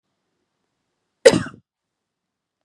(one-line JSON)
{"cough_length": "2.6 s", "cough_amplitude": 32768, "cough_signal_mean_std_ratio": 0.16, "survey_phase": "beta (2021-08-13 to 2022-03-07)", "age": "18-44", "gender": "Female", "wearing_mask": "No", "symptom_none": true, "smoker_status": "Never smoked", "respiratory_condition_asthma": false, "respiratory_condition_other": false, "recruitment_source": "REACT", "submission_delay": "2 days", "covid_test_result": "Negative", "covid_test_method": "RT-qPCR", "influenza_a_test_result": "Negative", "influenza_b_test_result": "Negative"}